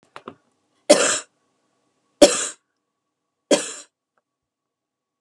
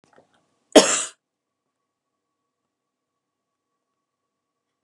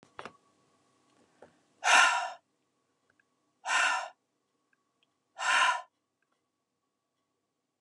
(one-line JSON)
{"three_cough_length": "5.2 s", "three_cough_amplitude": 32768, "three_cough_signal_mean_std_ratio": 0.24, "cough_length": "4.8 s", "cough_amplitude": 32768, "cough_signal_mean_std_ratio": 0.15, "exhalation_length": "7.8 s", "exhalation_amplitude": 11817, "exhalation_signal_mean_std_ratio": 0.31, "survey_phase": "beta (2021-08-13 to 2022-03-07)", "age": "45-64", "gender": "Female", "wearing_mask": "No", "symptom_none": true, "smoker_status": "Never smoked", "respiratory_condition_asthma": false, "respiratory_condition_other": false, "recruitment_source": "REACT", "submission_delay": "10 days", "covid_test_result": "Negative", "covid_test_method": "RT-qPCR"}